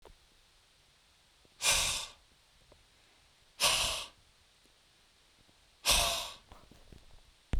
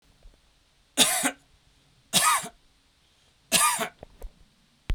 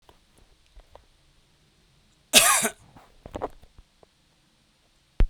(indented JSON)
{
  "exhalation_length": "7.6 s",
  "exhalation_amplitude": 7496,
  "exhalation_signal_mean_std_ratio": 0.36,
  "three_cough_length": "4.9 s",
  "three_cough_amplitude": 20092,
  "three_cough_signal_mean_std_ratio": 0.37,
  "cough_length": "5.3 s",
  "cough_amplitude": 32768,
  "cough_signal_mean_std_ratio": 0.24,
  "survey_phase": "beta (2021-08-13 to 2022-03-07)",
  "age": "45-64",
  "gender": "Male",
  "wearing_mask": "No",
  "symptom_none": true,
  "smoker_status": "Never smoked",
  "respiratory_condition_asthma": false,
  "respiratory_condition_other": false,
  "recruitment_source": "REACT",
  "submission_delay": "1 day",
  "covid_test_result": "Negative",
  "covid_test_method": "RT-qPCR"
}